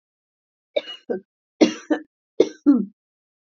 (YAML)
three_cough_length: 3.6 s
three_cough_amplitude: 27151
three_cough_signal_mean_std_ratio: 0.3
survey_phase: beta (2021-08-13 to 2022-03-07)
age: 45-64
gender: Female
wearing_mask: 'No'
symptom_none: true
symptom_onset: 12 days
smoker_status: Never smoked
respiratory_condition_asthma: false
respiratory_condition_other: false
recruitment_source: REACT
submission_delay: 3 days
covid_test_result: Negative
covid_test_method: RT-qPCR
influenza_a_test_result: Negative
influenza_b_test_result: Negative